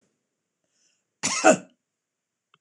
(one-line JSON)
{"cough_length": "2.6 s", "cough_amplitude": 25763, "cough_signal_mean_std_ratio": 0.23, "survey_phase": "beta (2021-08-13 to 2022-03-07)", "age": "45-64", "gender": "Female", "wearing_mask": "No", "symptom_none": true, "smoker_status": "Ex-smoker", "respiratory_condition_asthma": false, "respiratory_condition_other": false, "recruitment_source": "REACT", "submission_delay": "2 days", "covid_test_result": "Negative", "covid_test_method": "RT-qPCR", "influenza_a_test_result": "Negative", "influenza_b_test_result": "Negative"}